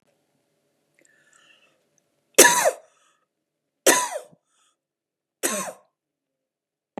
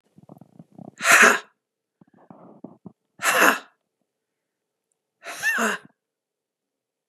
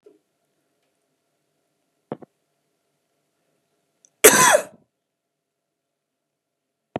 {"three_cough_length": "7.0 s", "three_cough_amplitude": 32768, "three_cough_signal_mean_std_ratio": 0.23, "exhalation_length": "7.1 s", "exhalation_amplitude": 31593, "exhalation_signal_mean_std_ratio": 0.3, "cough_length": "7.0 s", "cough_amplitude": 32768, "cough_signal_mean_std_ratio": 0.18, "survey_phase": "beta (2021-08-13 to 2022-03-07)", "age": "65+", "gender": "Female", "wearing_mask": "No", "symptom_none": true, "smoker_status": "Ex-smoker", "respiratory_condition_asthma": false, "respiratory_condition_other": false, "recruitment_source": "REACT", "submission_delay": "3 days", "covid_test_result": "Negative", "covid_test_method": "RT-qPCR", "influenza_a_test_result": "Negative", "influenza_b_test_result": "Negative"}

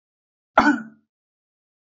{"cough_length": "2.0 s", "cough_amplitude": 27658, "cough_signal_mean_std_ratio": 0.25, "survey_phase": "beta (2021-08-13 to 2022-03-07)", "age": "45-64", "gender": "Male", "wearing_mask": "No", "symptom_none": true, "symptom_onset": "7 days", "smoker_status": "Ex-smoker", "respiratory_condition_asthma": false, "respiratory_condition_other": false, "recruitment_source": "REACT", "submission_delay": "2 days", "covid_test_result": "Negative", "covid_test_method": "RT-qPCR"}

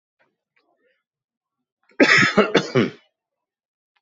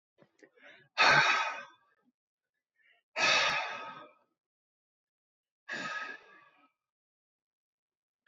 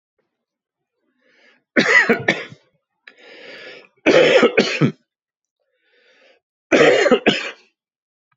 {"cough_length": "4.0 s", "cough_amplitude": 28338, "cough_signal_mean_std_ratio": 0.32, "exhalation_length": "8.3 s", "exhalation_amplitude": 9911, "exhalation_signal_mean_std_ratio": 0.33, "three_cough_length": "8.4 s", "three_cough_amplitude": 29827, "three_cough_signal_mean_std_ratio": 0.39, "survey_phase": "beta (2021-08-13 to 2022-03-07)", "age": "45-64", "gender": "Male", "wearing_mask": "No", "symptom_cough_any": true, "symptom_new_continuous_cough": true, "symptom_runny_or_blocked_nose": true, "symptom_shortness_of_breath": true, "symptom_sore_throat": true, "symptom_abdominal_pain": true, "symptom_diarrhoea": true, "symptom_headache": true, "smoker_status": "Never smoked", "respiratory_condition_asthma": false, "respiratory_condition_other": false, "recruitment_source": "Test and Trace", "submission_delay": "2 days", "covid_test_result": "Positive", "covid_test_method": "RT-qPCR", "covid_ct_value": 23.1, "covid_ct_gene": "ORF1ab gene", "covid_ct_mean": 23.6, "covid_viral_load": "18000 copies/ml", "covid_viral_load_category": "Low viral load (10K-1M copies/ml)"}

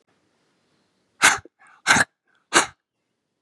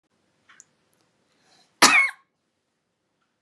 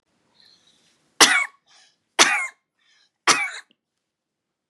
{"exhalation_length": "3.4 s", "exhalation_amplitude": 30157, "exhalation_signal_mean_std_ratio": 0.27, "cough_length": "3.4 s", "cough_amplitude": 30925, "cough_signal_mean_std_ratio": 0.22, "three_cough_length": "4.7 s", "three_cough_amplitude": 32768, "three_cough_signal_mean_std_ratio": 0.28, "survey_phase": "beta (2021-08-13 to 2022-03-07)", "age": "18-44", "gender": "Female", "wearing_mask": "No", "symptom_none": true, "smoker_status": "Ex-smoker", "respiratory_condition_asthma": false, "respiratory_condition_other": false, "recruitment_source": "REACT", "submission_delay": "1 day", "covid_test_result": "Negative", "covid_test_method": "RT-qPCR", "influenza_a_test_result": "Negative", "influenza_b_test_result": "Negative"}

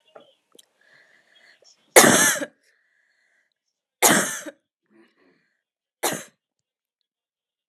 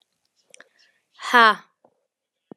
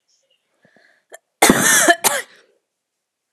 {"three_cough_length": "7.7 s", "three_cough_amplitude": 32768, "three_cough_signal_mean_std_ratio": 0.25, "exhalation_length": "2.6 s", "exhalation_amplitude": 28479, "exhalation_signal_mean_std_ratio": 0.23, "cough_length": "3.3 s", "cough_amplitude": 32768, "cough_signal_mean_std_ratio": 0.35, "survey_phase": "alpha (2021-03-01 to 2021-08-12)", "age": "18-44", "gender": "Female", "wearing_mask": "No", "symptom_change_to_sense_of_smell_or_taste": true, "symptom_loss_of_taste": true, "symptom_onset": "7 days", "smoker_status": "Never smoked", "respiratory_condition_asthma": false, "respiratory_condition_other": false, "recruitment_source": "Test and Trace", "submission_delay": "3 days", "covid_test_result": "Positive", "covid_test_method": "RT-qPCR"}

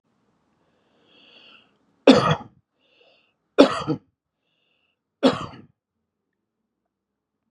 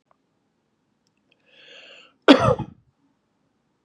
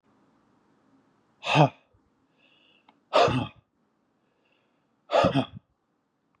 {"three_cough_length": "7.5 s", "three_cough_amplitude": 32556, "three_cough_signal_mean_std_ratio": 0.22, "cough_length": "3.8 s", "cough_amplitude": 32768, "cough_signal_mean_std_ratio": 0.2, "exhalation_length": "6.4 s", "exhalation_amplitude": 19078, "exhalation_signal_mean_std_ratio": 0.28, "survey_phase": "beta (2021-08-13 to 2022-03-07)", "age": "45-64", "gender": "Male", "wearing_mask": "No", "symptom_none": true, "smoker_status": "Never smoked", "respiratory_condition_asthma": false, "respiratory_condition_other": false, "recruitment_source": "REACT", "submission_delay": "1 day", "covid_test_result": "Negative", "covid_test_method": "RT-qPCR", "influenza_a_test_result": "Negative", "influenza_b_test_result": "Negative"}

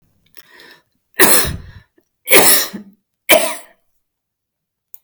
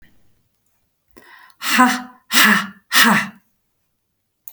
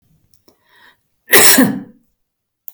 {"three_cough_length": "5.0 s", "three_cough_amplitude": 32768, "three_cough_signal_mean_std_ratio": 0.35, "exhalation_length": "4.5 s", "exhalation_amplitude": 32768, "exhalation_signal_mean_std_ratio": 0.39, "cough_length": "2.7 s", "cough_amplitude": 32768, "cough_signal_mean_std_ratio": 0.34, "survey_phase": "beta (2021-08-13 to 2022-03-07)", "age": "65+", "gender": "Female", "wearing_mask": "No", "symptom_none": true, "smoker_status": "Ex-smoker", "respiratory_condition_asthma": false, "respiratory_condition_other": false, "recruitment_source": "REACT", "submission_delay": "3 days", "covid_test_result": "Negative", "covid_test_method": "RT-qPCR"}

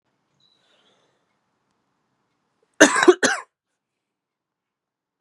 {"cough_length": "5.2 s", "cough_amplitude": 32768, "cough_signal_mean_std_ratio": 0.2, "survey_phase": "beta (2021-08-13 to 2022-03-07)", "age": "18-44", "gender": "Female", "wearing_mask": "No", "symptom_cough_any": true, "symptom_runny_or_blocked_nose": true, "symptom_fever_high_temperature": true, "symptom_headache": true, "symptom_onset": "4 days", "smoker_status": "Never smoked", "respiratory_condition_asthma": false, "respiratory_condition_other": false, "recruitment_source": "Test and Trace", "submission_delay": "2 days", "covid_test_result": "Positive", "covid_test_method": "RT-qPCR", "covid_ct_value": 26.8, "covid_ct_gene": "ORF1ab gene", "covid_ct_mean": 27.2, "covid_viral_load": "1200 copies/ml", "covid_viral_load_category": "Minimal viral load (< 10K copies/ml)"}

